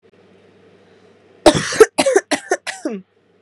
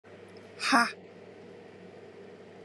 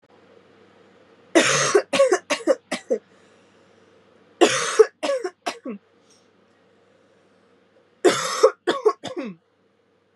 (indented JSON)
{
  "cough_length": "3.4 s",
  "cough_amplitude": 32768,
  "cough_signal_mean_std_ratio": 0.33,
  "exhalation_length": "2.6 s",
  "exhalation_amplitude": 13305,
  "exhalation_signal_mean_std_ratio": 0.36,
  "three_cough_length": "10.2 s",
  "three_cough_amplitude": 29455,
  "three_cough_signal_mean_std_ratio": 0.37,
  "survey_phase": "beta (2021-08-13 to 2022-03-07)",
  "age": "18-44",
  "gender": "Female",
  "wearing_mask": "No",
  "symptom_cough_any": true,
  "symptom_new_continuous_cough": true,
  "symptom_sore_throat": true,
  "symptom_abdominal_pain": true,
  "symptom_diarrhoea": true,
  "symptom_fatigue": true,
  "symptom_fever_high_temperature": true,
  "symptom_headache": true,
  "symptom_onset": "3 days",
  "smoker_status": "Never smoked",
  "recruitment_source": "Test and Trace",
  "submission_delay": "2 days",
  "covid_test_result": "Positive",
  "covid_test_method": "RT-qPCR",
  "covid_ct_value": 20.3,
  "covid_ct_gene": "ORF1ab gene"
}